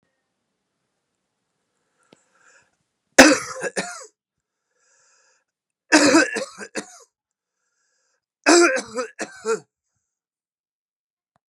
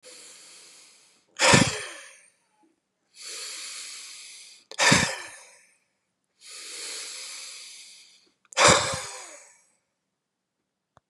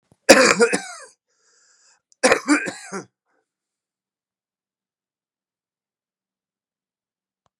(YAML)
three_cough_length: 11.5 s
three_cough_amplitude: 32768
three_cough_signal_mean_std_ratio: 0.26
exhalation_length: 11.1 s
exhalation_amplitude: 24166
exhalation_signal_mean_std_ratio: 0.32
cough_length: 7.6 s
cough_amplitude: 32768
cough_signal_mean_std_ratio: 0.24
survey_phase: beta (2021-08-13 to 2022-03-07)
age: 65+
gender: Male
wearing_mask: 'No'
symptom_cough_any: true
symptom_runny_or_blocked_nose: true
symptom_sore_throat: true
symptom_headache: true
symptom_onset: 3 days
smoker_status: Never smoked
respiratory_condition_asthma: false
respiratory_condition_other: false
recruitment_source: Test and Trace
submission_delay: 1 day
covid_test_result: Negative
covid_test_method: ePCR